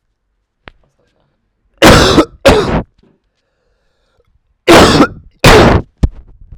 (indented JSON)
{
  "cough_length": "6.6 s",
  "cough_amplitude": 32768,
  "cough_signal_mean_std_ratio": 0.44,
  "survey_phase": "alpha (2021-03-01 to 2021-08-12)",
  "age": "18-44",
  "gender": "Male",
  "wearing_mask": "No",
  "symptom_cough_any": true,
  "symptom_fatigue": true,
  "symptom_headache": true,
  "smoker_status": "Ex-smoker",
  "respiratory_condition_asthma": false,
  "respiratory_condition_other": false,
  "recruitment_source": "Test and Trace",
  "submission_delay": "3 days",
  "covid_test_result": "Positive",
  "covid_test_method": "LFT"
}